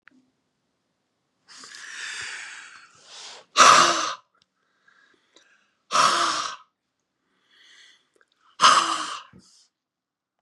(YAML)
exhalation_length: 10.4 s
exhalation_amplitude: 29690
exhalation_signal_mean_std_ratio: 0.31
survey_phase: beta (2021-08-13 to 2022-03-07)
age: 65+
gender: Male
wearing_mask: 'No'
symptom_none: true
smoker_status: Never smoked
respiratory_condition_asthma: false
respiratory_condition_other: false
recruitment_source: REACT
submission_delay: 1 day
covid_test_result: Negative
covid_test_method: RT-qPCR